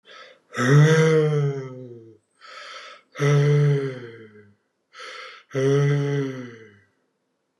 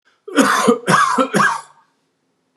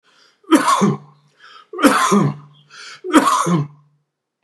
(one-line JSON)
{"exhalation_length": "7.6 s", "exhalation_amplitude": 16789, "exhalation_signal_mean_std_ratio": 0.56, "cough_length": "2.6 s", "cough_amplitude": 31466, "cough_signal_mean_std_ratio": 0.57, "three_cough_length": "4.4 s", "three_cough_amplitude": 32768, "three_cough_signal_mean_std_ratio": 0.51, "survey_phase": "beta (2021-08-13 to 2022-03-07)", "age": "65+", "gender": "Male", "wearing_mask": "No", "symptom_none": true, "smoker_status": "Never smoked", "respiratory_condition_asthma": false, "respiratory_condition_other": false, "recruitment_source": "REACT", "submission_delay": "2 days", "covid_test_result": "Negative", "covid_test_method": "RT-qPCR", "covid_ct_value": 46.0, "covid_ct_gene": "N gene"}